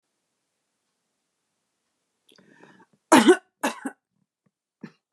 cough_length: 5.1 s
cough_amplitude: 29609
cough_signal_mean_std_ratio: 0.19
survey_phase: beta (2021-08-13 to 2022-03-07)
age: 45-64
gender: Female
wearing_mask: 'No'
symptom_fatigue: true
symptom_onset: 12 days
smoker_status: Never smoked
respiratory_condition_asthma: false
respiratory_condition_other: false
recruitment_source: REACT
submission_delay: 1 day
covid_test_result: Negative
covid_test_method: RT-qPCR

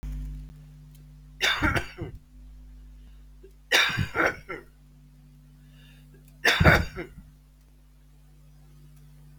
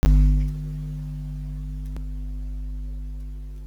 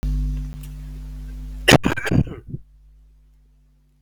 three_cough_length: 9.4 s
three_cough_amplitude: 23117
three_cough_signal_mean_std_ratio: 0.39
exhalation_length: 3.7 s
exhalation_amplitude: 10783
exhalation_signal_mean_std_ratio: 0.78
cough_length: 4.0 s
cough_amplitude: 32768
cough_signal_mean_std_ratio: 0.47
survey_phase: beta (2021-08-13 to 2022-03-07)
age: 65+
gender: Male
wearing_mask: 'No'
symptom_cough_any: true
symptom_sore_throat: true
symptom_abdominal_pain: true
symptom_fatigue: true
symptom_fever_high_temperature: true
symptom_onset: 3 days
smoker_status: Never smoked
respiratory_condition_asthma: false
respiratory_condition_other: false
recruitment_source: Test and Trace
submission_delay: 1 day
covid_test_result: Negative
covid_test_method: RT-qPCR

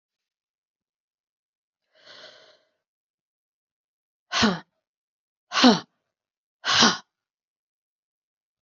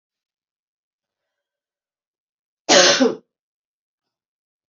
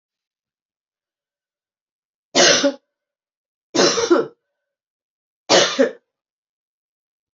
exhalation_length: 8.6 s
exhalation_amplitude: 26463
exhalation_signal_mean_std_ratio: 0.22
cough_length: 4.7 s
cough_amplitude: 32765
cough_signal_mean_std_ratio: 0.24
three_cough_length: 7.3 s
three_cough_amplitude: 28658
three_cough_signal_mean_std_ratio: 0.32
survey_phase: beta (2021-08-13 to 2022-03-07)
age: 45-64
gender: Female
wearing_mask: 'No'
symptom_cough_any: true
symptom_new_continuous_cough: true
symptom_runny_or_blocked_nose: true
symptom_shortness_of_breath: true
symptom_fatigue: true
symptom_fever_high_temperature: true
symptom_headache: true
symptom_other: true
symptom_onset: 3 days
smoker_status: Never smoked
respiratory_condition_asthma: false
respiratory_condition_other: false
recruitment_source: Test and Trace
submission_delay: 2 days
covid_test_result: Positive
covid_test_method: RT-qPCR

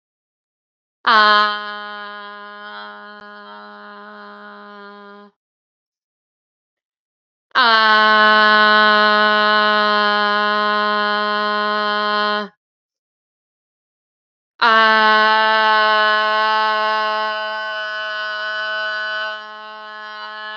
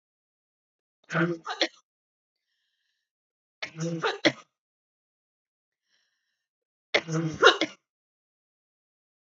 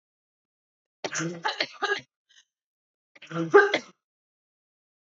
exhalation_length: 20.6 s
exhalation_amplitude: 30051
exhalation_signal_mean_std_ratio: 0.56
three_cough_length: 9.3 s
three_cough_amplitude: 25867
three_cough_signal_mean_std_ratio: 0.25
cough_length: 5.1 s
cough_amplitude: 21199
cough_signal_mean_std_ratio: 0.28
survey_phase: beta (2021-08-13 to 2022-03-07)
age: 18-44
gender: Female
wearing_mask: 'No'
symptom_cough_any: true
symptom_runny_or_blocked_nose: true
symptom_fatigue: true
symptom_change_to_sense_of_smell_or_taste: true
symptom_loss_of_taste: true
symptom_onset: 3 days
smoker_status: Ex-smoker
respiratory_condition_asthma: false
respiratory_condition_other: false
recruitment_source: Test and Trace
submission_delay: 1 day
covid_test_result: Positive
covid_test_method: RT-qPCR
covid_ct_value: 19.1
covid_ct_gene: ORF1ab gene
covid_ct_mean: 19.5
covid_viral_load: 410000 copies/ml
covid_viral_load_category: Low viral load (10K-1M copies/ml)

